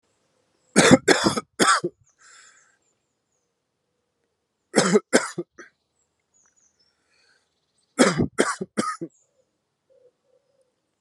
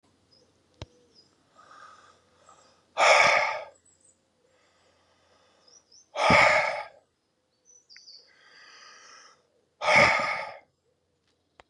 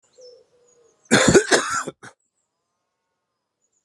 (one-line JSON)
{"three_cough_length": "11.0 s", "three_cough_amplitude": 32172, "three_cough_signal_mean_std_ratio": 0.29, "exhalation_length": "11.7 s", "exhalation_amplitude": 16991, "exhalation_signal_mean_std_ratio": 0.32, "cough_length": "3.8 s", "cough_amplitude": 32553, "cough_signal_mean_std_ratio": 0.31, "survey_phase": "beta (2021-08-13 to 2022-03-07)", "age": "18-44", "gender": "Male", "wearing_mask": "No", "symptom_cough_any": true, "symptom_runny_or_blocked_nose": true, "symptom_sore_throat": true, "symptom_abdominal_pain": true, "symptom_fatigue": true, "symptom_fever_high_temperature": true, "symptom_headache": true, "symptom_change_to_sense_of_smell_or_taste": true, "symptom_loss_of_taste": true, "smoker_status": "Never smoked", "respiratory_condition_asthma": false, "respiratory_condition_other": false, "recruitment_source": "Test and Trace", "submission_delay": "2 days", "covid_test_result": "Positive", "covid_test_method": "RT-qPCR", "covid_ct_value": 21.1, "covid_ct_gene": "ORF1ab gene", "covid_ct_mean": 22.3, "covid_viral_load": "50000 copies/ml", "covid_viral_load_category": "Low viral load (10K-1M copies/ml)"}